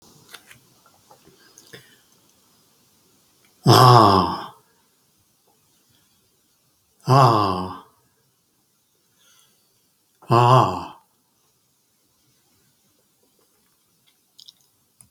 {"exhalation_length": "15.1 s", "exhalation_amplitude": 32768, "exhalation_signal_mean_std_ratio": 0.27, "survey_phase": "beta (2021-08-13 to 2022-03-07)", "age": "65+", "gender": "Male", "wearing_mask": "No", "symptom_none": true, "smoker_status": "Ex-smoker", "respiratory_condition_asthma": true, "respiratory_condition_other": true, "recruitment_source": "REACT", "submission_delay": "1 day", "covid_test_result": "Negative", "covid_test_method": "RT-qPCR", "influenza_a_test_result": "Negative", "influenza_b_test_result": "Negative"}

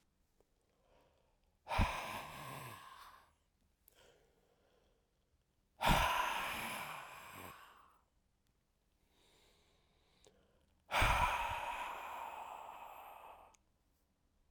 {"exhalation_length": "14.5 s", "exhalation_amplitude": 4567, "exhalation_signal_mean_std_ratio": 0.39, "survey_phase": "alpha (2021-03-01 to 2021-08-12)", "age": "65+", "gender": "Male", "wearing_mask": "No", "symptom_none": true, "smoker_status": "Ex-smoker", "respiratory_condition_asthma": false, "respiratory_condition_other": false, "recruitment_source": "Test and Trace", "submission_delay": "1 day", "covid_test_result": "Positive", "covid_test_method": "RT-qPCR"}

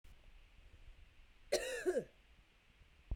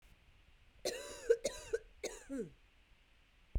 {"cough_length": "3.2 s", "cough_amplitude": 2379, "cough_signal_mean_std_ratio": 0.41, "three_cough_length": "3.6 s", "three_cough_amplitude": 4011, "three_cough_signal_mean_std_ratio": 0.37, "survey_phase": "beta (2021-08-13 to 2022-03-07)", "age": "18-44", "gender": "Female", "wearing_mask": "No", "symptom_fatigue": true, "symptom_fever_high_temperature": true, "symptom_change_to_sense_of_smell_or_taste": true, "symptom_other": true, "smoker_status": "Never smoked", "respiratory_condition_asthma": true, "respiratory_condition_other": false, "recruitment_source": "Test and Trace", "submission_delay": "2 days", "covid_test_result": "Positive", "covid_test_method": "RT-qPCR"}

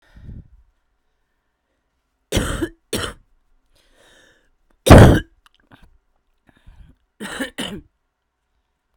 {"three_cough_length": "9.0 s", "three_cough_amplitude": 32768, "three_cough_signal_mean_std_ratio": 0.21, "survey_phase": "beta (2021-08-13 to 2022-03-07)", "age": "18-44", "gender": "Female", "wearing_mask": "No", "symptom_cough_any": true, "symptom_runny_or_blocked_nose": true, "symptom_sore_throat": true, "symptom_diarrhoea": true, "symptom_fatigue": true, "symptom_change_to_sense_of_smell_or_taste": true, "symptom_loss_of_taste": true, "smoker_status": "Current smoker (11 or more cigarettes per day)", "respiratory_condition_asthma": false, "respiratory_condition_other": false, "recruitment_source": "Test and Trace", "submission_delay": "1 day", "covid_test_result": "Positive", "covid_test_method": "RT-qPCR"}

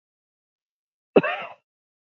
{"cough_length": "2.1 s", "cough_amplitude": 26318, "cough_signal_mean_std_ratio": 0.2, "survey_phase": "beta (2021-08-13 to 2022-03-07)", "age": "65+", "gender": "Male", "wearing_mask": "No", "symptom_runny_or_blocked_nose": true, "symptom_fatigue": true, "smoker_status": "Ex-smoker", "respiratory_condition_asthma": true, "respiratory_condition_other": false, "recruitment_source": "Test and Trace", "submission_delay": "0 days", "covid_test_result": "Negative", "covid_test_method": "LFT"}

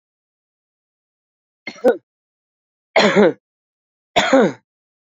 {"three_cough_length": "5.1 s", "three_cough_amplitude": 28660, "three_cough_signal_mean_std_ratio": 0.31, "survey_phase": "beta (2021-08-13 to 2022-03-07)", "age": "45-64", "gender": "Male", "wearing_mask": "No", "symptom_none": true, "smoker_status": "Never smoked", "respiratory_condition_asthma": false, "respiratory_condition_other": false, "recruitment_source": "REACT", "submission_delay": "1 day", "covid_test_result": "Negative", "covid_test_method": "RT-qPCR", "influenza_a_test_result": "Negative", "influenza_b_test_result": "Negative"}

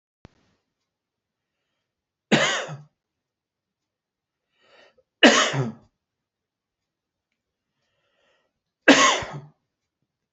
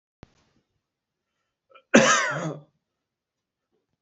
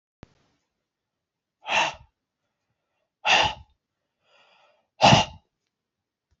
{"three_cough_length": "10.3 s", "three_cough_amplitude": 30538, "three_cough_signal_mean_std_ratio": 0.24, "cough_length": "4.0 s", "cough_amplitude": 26864, "cough_signal_mean_std_ratio": 0.26, "exhalation_length": "6.4 s", "exhalation_amplitude": 24800, "exhalation_signal_mean_std_ratio": 0.25, "survey_phase": "beta (2021-08-13 to 2022-03-07)", "age": "45-64", "gender": "Male", "wearing_mask": "No", "symptom_cough_any": true, "symptom_sore_throat": true, "symptom_fatigue": true, "symptom_other": true, "smoker_status": "Never smoked", "respiratory_condition_asthma": false, "respiratory_condition_other": false, "recruitment_source": "REACT", "submission_delay": "3 days", "covid_test_result": "Negative", "covid_test_method": "RT-qPCR", "influenza_a_test_result": "Unknown/Void", "influenza_b_test_result": "Unknown/Void"}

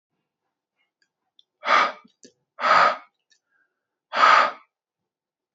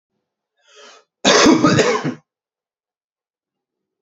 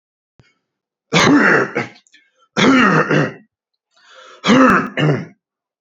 {"exhalation_length": "5.5 s", "exhalation_amplitude": 24780, "exhalation_signal_mean_std_ratio": 0.33, "cough_length": "4.0 s", "cough_amplitude": 32768, "cough_signal_mean_std_ratio": 0.37, "three_cough_length": "5.8 s", "three_cough_amplitude": 30012, "three_cough_signal_mean_std_ratio": 0.52, "survey_phase": "beta (2021-08-13 to 2022-03-07)", "age": "18-44", "gender": "Male", "wearing_mask": "No", "symptom_cough_any": true, "symptom_runny_or_blocked_nose": true, "symptom_shortness_of_breath": true, "symptom_sore_throat": true, "symptom_diarrhoea": true, "symptom_headache": true, "smoker_status": "Never smoked", "respiratory_condition_asthma": false, "respiratory_condition_other": false, "recruitment_source": "Test and Trace", "submission_delay": "31 days", "covid_test_result": "Negative", "covid_test_method": "RT-qPCR"}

